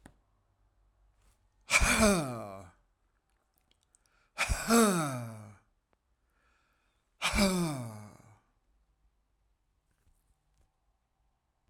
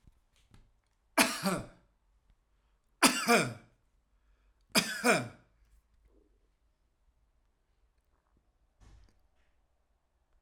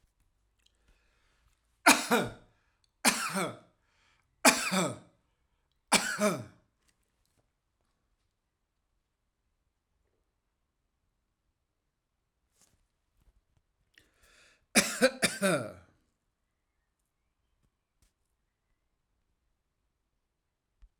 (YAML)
exhalation_length: 11.7 s
exhalation_amplitude: 9950
exhalation_signal_mean_std_ratio: 0.34
three_cough_length: 10.4 s
three_cough_amplitude: 14378
three_cough_signal_mean_std_ratio: 0.26
cough_length: 21.0 s
cough_amplitude: 14932
cough_signal_mean_std_ratio: 0.23
survey_phase: alpha (2021-03-01 to 2021-08-12)
age: 65+
gender: Male
wearing_mask: 'No'
symptom_none: true
smoker_status: Never smoked
respiratory_condition_asthma: false
respiratory_condition_other: false
recruitment_source: REACT
submission_delay: 1 day
covid_test_result: Negative
covid_test_method: RT-qPCR